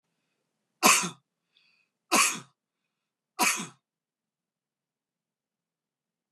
{"three_cough_length": "6.3 s", "three_cough_amplitude": 17091, "three_cough_signal_mean_std_ratio": 0.25, "survey_phase": "beta (2021-08-13 to 2022-03-07)", "age": "45-64", "gender": "Male", "wearing_mask": "No", "symptom_cough_any": true, "symptom_runny_or_blocked_nose": true, "symptom_headache": true, "symptom_change_to_sense_of_smell_or_taste": true, "symptom_loss_of_taste": true, "smoker_status": "Ex-smoker", "respiratory_condition_asthma": false, "respiratory_condition_other": false, "recruitment_source": "Test and Trace", "submission_delay": "1 day", "covid_test_result": "Positive", "covid_test_method": "RT-qPCR", "covid_ct_value": 21.9, "covid_ct_gene": "ORF1ab gene", "covid_ct_mean": 22.6, "covid_viral_load": "40000 copies/ml", "covid_viral_load_category": "Low viral load (10K-1M copies/ml)"}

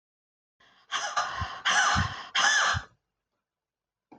{"exhalation_length": "4.2 s", "exhalation_amplitude": 10226, "exhalation_signal_mean_std_ratio": 0.51, "survey_phase": "beta (2021-08-13 to 2022-03-07)", "age": "65+", "gender": "Female", "wearing_mask": "No", "symptom_none": true, "smoker_status": "Ex-smoker", "respiratory_condition_asthma": false, "respiratory_condition_other": false, "recruitment_source": "REACT", "submission_delay": "2 days", "covid_test_result": "Negative", "covid_test_method": "RT-qPCR"}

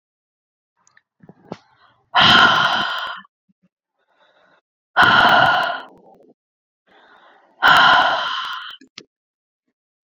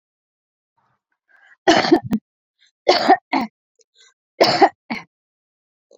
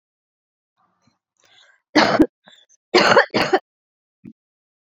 {"exhalation_length": "10.1 s", "exhalation_amplitude": 29966, "exhalation_signal_mean_std_ratio": 0.41, "three_cough_length": "6.0 s", "three_cough_amplitude": 29883, "three_cough_signal_mean_std_ratio": 0.32, "cough_length": "4.9 s", "cough_amplitude": 28753, "cough_signal_mean_std_ratio": 0.31, "survey_phase": "beta (2021-08-13 to 2022-03-07)", "age": "18-44", "gender": "Female", "wearing_mask": "No", "symptom_cough_any": true, "symptom_runny_or_blocked_nose": true, "symptom_sore_throat": true, "symptom_abdominal_pain": true, "symptom_fatigue": true, "symptom_headache": true, "smoker_status": "Current smoker (11 or more cigarettes per day)", "respiratory_condition_asthma": false, "respiratory_condition_other": false, "recruitment_source": "Test and Trace", "submission_delay": "1 day", "covid_test_result": "Positive", "covid_test_method": "RT-qPCR"}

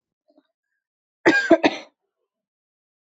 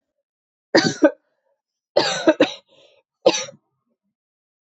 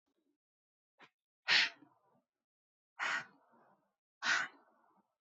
{"cough_length": "3.2 s", "cough_amplitude": 26177, "cough_signal_mean_std_ratio": 0.26, "three_cough_length": "4.6 s", "three_cough_amplitude": 27014, "three_cough_signal_mean_std_ratio": 0.31, "exhalation_length": "5.2 s", "exhalation_amplitude": 4598, "exhalation_signal_mean_std_ratio": 0.28, "survey_phase": "beta (2021-08-13 to 2022-03-07)", "age": "18-44", "gender": "Female", "wearing_mask": "No", "symptom_cough_any": true, "symptom_runny_or_blocked_nose": true, "symptom_shortness_of_breath": true, "symptom_sore_throat": true, "symptom_fatigue": true, "symptom_headache": true, "symptom_onset": "2 days", "smoker_status": "Never smoked", "respiratory_condition_asthma": false, "respiratory_condition_other": false, "recruitment_source": "Test and Trace", "submission_delay": "1 day", "covid_test_result": "Positive", "covid_test_method": "RT-qPCR", "covid_ct_value": 17.7, "covid_ct_gene": "ORF1ab gene", "covid_ct_mean": 18.2, "covid_viral_load": "1100000 copies/ml", "covid_viral_load_category": "High viral load (>1M copies/ml)"}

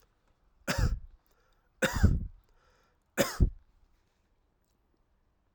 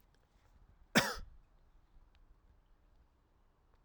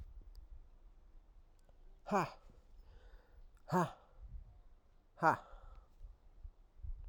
{"three_cough_length": "5.5 s", "three_cough_amplitude": 10247, "three_cough_signal_mean_std_ratio": 0.31, "cough_length": "3.8 s", "cough_amplitude": 6122, "cough_signal_mean_std_ratio": 0.21, "exhalation_length": "7.1 s", "exhalation_amplitude": 4672, "exhalation_signal_mean_std_ratio": 0.37, "survey_phase": "alpha (2021-03-01 to 2021-08-12)", "age": "45-64", "gender": "Male", "wearing_mask": "No", "symptom_none": true, "smoker_status": "Never smoked", "respiratory_condition_asthma": false, "respiratory_condition_other": false, "recruitment_source": "REACT", "submission_delay": "3 days", "covid_test_result": "Negative", "covid_test_method": "RT-qPCR"}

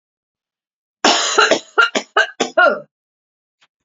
{"cough_length": "3.8 s", "cough_amplitude": 32768, "cough_signal_mean_std_ratio": 0.42, "survey_phase": "beta (2021-08-13 to 2022-03-07)", "age": "18-44", "gender": "Female", "wearing_mask": "No", "symptom_cough_any": true, "symptom_fatigue": true, "symptom_headache": true, "symptom_other": true, "smoker_status": "Never smoked", "respiratory_condition_asthma": false, "respiratory_condition_other": false, "recruitment_source": "Test and Trace", "submission_delay": "2 days", "covid_test_result": "Positive", "covid_test_method": "RT-qPCR", "covid_ct_value": 33.7, "covid_ct_gene": "ORF1ab gene", "covid_ct_mean": 34.6, "covid_viral_load": "4.5 copies/ml", "covid_viral_load_category": "Minimal viral load (< 10K copies/ml)"}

